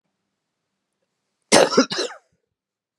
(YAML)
cough_length: 3.0 s
cough_amplitude: 32623
cough_signal_mean_std_ratio: 0.27
survey_phase: beta (2021-08-13 to 2022-03-07)
age: 45-64
gender: Female
wearing_mask: 'No'
symptom_cough_any: true
symptom_runny_or_blocked_nose: true
symptom_shortness_of_breath: true
symptom_sore_throat: true
symptom_abdominal_pain: true
symptom_fatigue: true
symptom_fever_high_temperature: true
symptom_headache: true
symptom_change_to_sense_of_smell_or_taste: true
symptom_onset: 3 days
smoker_status: Never smoked
respiratory_condition_asthma: false
respiratory_condition_other: false
recruitment_source: Test and Trace
submission_delay: 2 days
covid_test_result: Positive
covid_test_method: RT-qPCR
covid_ct_value: 14.7
covid_ct_gene: ORF1ab gene
covid_ct_mean: 15.0
covid_viral_load: 12000000 copies/ml
covid_viral_load_category: High viral load (>1M copies/ml)